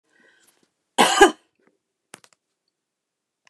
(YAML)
cough_length: 3.5 s
cough_amplitude: 29203
cough_signal_mean_std_ratio: 0.21
survey_phase: beta (2021-08-13 to 2022-03-07)
age: 65+
gender: Female
wearing_mask: 'No'
symptom_none: true
smoker_status: Never smoked
respiratory_condition_asthma: false
respiratory_condition_other: false
recruitment_source: REACT
submission_delay: 2 days
covid_test_result: Negative
covid_test_method: RT-qPCR